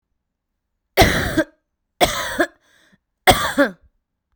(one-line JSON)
{"three_cough_length": "4.4 s", "three_cough_amplitude": 32768, "three_cough_signal_mean_std_ratio": 0.37, "survey_phase": "beta (2021-08-13 to 2022-03-07)", "age": "18-44", "gender": "Female", "wearing_mask": "No", "symptom_none": true, "smoker_status": "Ex-smoker", "respiratory_condition_asthma": true, "respiratory_condition_other": false, "recruitment_source": "REACT", "submission_delay": "2 days", "covid_test_result": "Negative", "covid_test_method": "RT-qPCR", "influenza_a_test_result": "Unknown/Void", "influenza_b_test_result": "Unknown/Void"}